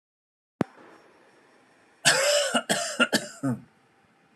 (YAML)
cough_length: 4.4 s
cough_amplitude: 18955
cough_signal_mean_std_ratio: 0.42
survey_phase: alpha (2021-03-01 to 2021-08-12)
age: 18-44
gender: Male
wearing_mask: 'No'
symptom_none: true
smoker_status: Never smoked
respiratory_condition_asthma: false
respiratory_condition_other: false
recruitment_source: REACT
submission_delay: 2 days
covid_test_result: Negative
covid_test_method: RT-qPCR